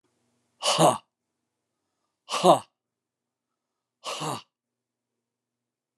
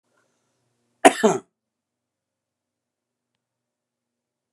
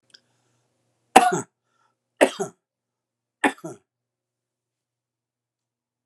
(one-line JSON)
{"exhalation_length": "6.0 s", "exhalation_amplitude": 20909, "exhalation_signal_mean_std_ratio": 0.25, "cough_length": "4.5 s", "cough_amplitude": 32768, "cough_signal_mean_std_ratio": 0.15, "three_cough_length": "6.1 s", "three_cough_amplitude": 32768, "three_cough_signal_mean_std_ratio": 0.19, "survey_phase": "alpha (2021-03-01 to 2021-08-12)", "age": "65+", "gender": "Male", "wearing_mask": "No", "symptom_none": true, "smoker_status": "Ex-smoker", "respiratory_condition_asthma": true, "respiratory_condition_other": false, "recruitment_source": "REACT", "submission_delay": "2 days", "covid_test_result": "Negative", "covid_test_method": "RT-qPCR"}